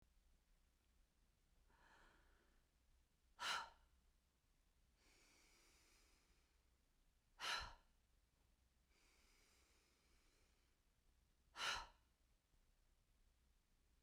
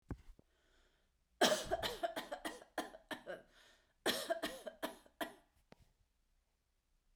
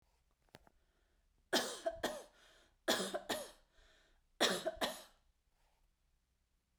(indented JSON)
{
  "exhalation_length": "14.0 s",
  "exhalation_amplitude": 721,
  "exhalation_signal_mean_std_ratio": 0.28,
  "cough_length": "7.2 s",
  "cough_amplitude": 5610,
  "cough_signal_mean_std_ratio": 0.37,
  "three_cough_length": "6.8 s",
  "three_cough_amplitude": 3376,
  "three_cough_signal_mean_std_ratio": 0.36,
  "survey_phase": "beta (2021-08-13 to 2022-03-07)",
  "age": "45-64",
  "gender": "Female",
  "wearing_mask": "No",
  "symptom_none": true,
  "smoker_status": "Never smoked",
  "respiratory_condition_asthma": false,
  "respiratory_condition_other": false,
  "recruitment_source": "REACT",
  "submission_delay": "1 day",
  "covid_test_result": "Negative",
  "covid_test_method": "RT-qPCR"
}